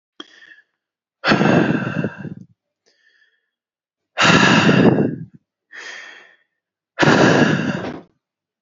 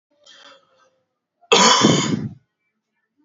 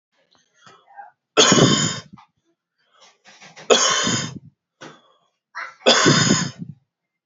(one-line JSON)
{"exhalation_length": "8.6 s", "exhalation_amplitude": 28177, "exhalation_signal_mean_std_ratio": 0.47, "cough_length": "3.2 s", "cough_amplitude": 29048, "cough_signal_mean_std_ratio": 0.38, "three_cough_length": "7.3 s", "three_cough_amplitude": 30530, "three_cough_signal_mean_std_ratio": 0.41, "survey_phase": "beta (2021-08-13 to 2022-03-07)", "age": "18-44", "gender": "Male", "wearing_mask": "No", "symptom_headache": true, "symptom_onset": "4 days", "smoker_status": "Ex-smoker", "respiratory_condition_asthma": false, "respiratory_condition_other": false, "recruitment_source": "REACT", "submission_delay": "-1 day", "covid_test_result": "Negative", "covid_test_method": "RT-qPCR", "influenza_a_test_result": "Negative", "influenza_b_test_result": "Negative"}